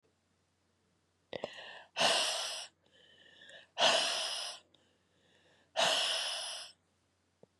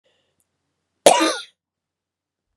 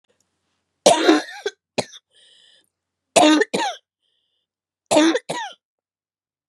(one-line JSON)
{"exhalation_length": "7.6 s", "exhalation_amplitude": 5762, "exhalation_signal_mean_std_ratio": 0.45, "cough_length": "2.6 s", "cough_amplitude": 32768, "cough_signal_mean_std_ratio": 0.24, "three_cough_length": "6.5 s", "three_cough_amplitude": 31822, "three_cough_signal_mean_std_ratio": 0.35, "survey_phase": "beta (2021-08-13 to 2022-03-07)", "age": "45-64", "gender": "Male", "wearing_mask": "No", "symptom_cough_any": true, "symptom_fatigue": true, "symptom_other": true, "smoker_status": "Never smoked", "respiratory_condition_asthma": false, "respiratory_condition_other": false, "recruitment_source": "Test and Trace", "submission_delay": "0 days", "covid_test_result": "Negative", "covid_test_method": "RT-qPCR"}